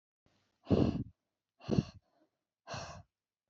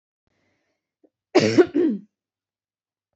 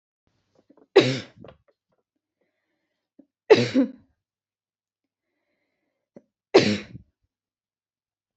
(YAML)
exhalation_length: 3.5 s
exhalation_amplitude: 5672
exhalation_signal_mean_std_ratio: 0.31
cough_length: 3.2 s
cough_amplitude: 23700
cough_signal_mean_std_ratio: 0.3
three_cough_length: 8.4 s
three_cough_amplitude: 27065
three_cough_signal_mean_std_ratio: 0.21
survey_phase: beta (2021-08-13 to 2022-03-07)
age: 18-44
gender: Female
wearing_mask: 'No'
symptom_none: true
smoker_status: Never smoked
respiratory_condition_asthma: true
respiratory_condition_other: false
recruitment_source: Test and Trace
submission_delay: 1 day
covid_test_result: Negative
covid_test_method: RT-qPCR